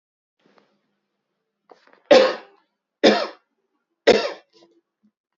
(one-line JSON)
{"three_cough_length": "5.4 s", "three_cough_amplitude": 27958, "three_cough_signal_mean_std_ratio": 0.26, "survey_phase": "alpha (2021-03-01 to 2021-08-12)", "age": "45-64", "gender": "Male", "wearing_mask": "No", "symptom_cough_any": true, "symptom_diarrhoea": true, "smoker_status": "Never smoked", "respiratory_condition_asthma": false, "respiratory_condition_other": false, "recruitment_source": "Test and Trace", "submission_delay": "2 days", "covid_test_result": "Positive", "covid_test_method": "ePCR"}